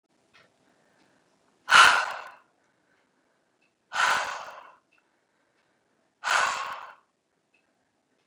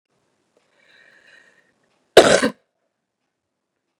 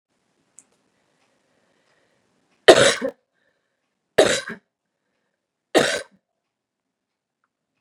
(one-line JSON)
{"exhalation_length": "8.3 s", "exhalation_amplitude": 24788, "exhalation_signal_mean_std_ratio": 0.27, "cough_length": "4.0 s", "cough_amplitude": 32768, "cough_signal_mean_std_ratio": 0.19, "three_cough_length": "7.8 s", "three_cough_amplitude": 32768, "three_cough_signal_mean_std_ratio": 0.22, "survey_phase": "beta (2021-08-13 to 2022-03-07)", "age": "45-64", "gender": "Female", "wearing_mask": "No", "symptom_cough_any": true, "smoker_status": "Never smoked", "respiratory_condition_asthma": false, "respiratory_condition_other": false, "recruitment_source": "REACT", "submission_delay": "2 days", "covid_test_result": "Negative", "covid_test_method": "RT-qPCR"}